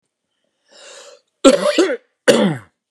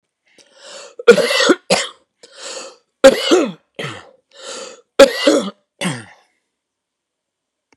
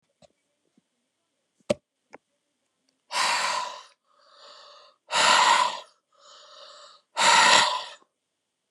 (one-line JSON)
{"cough_length": "2.9 s", "cough_amplitude": 32768, "cough_signal_mean_std_ratio": 0.4, "three_cough_length": "7.8 s", "three_cough_amplitude": 32768, "three_cough_signal_mean_std_ratio": 0.34, "exhalation_length": "8.7 s", "exhalation_amplitude": 23669, "exhalation_signal_mean_std_ratio": 0.37, "survey_phase": "beta (2021-08-13 to 2022-03-07)", "age": "45-64", "gender": "Male", "wearing_mask": "No", "symptom_cough_any": true, "symptom_runny_or_blocked_nose": true, "smoker_status": "Ex-smoker", "respiratory_condition_asthma": false, "respiratory_condition_other": false, "recruitment_source": "REACT", "submission_delay": "1 day", "covid_test_result": "Negative", "covid_test_method": "RT-qPCR"}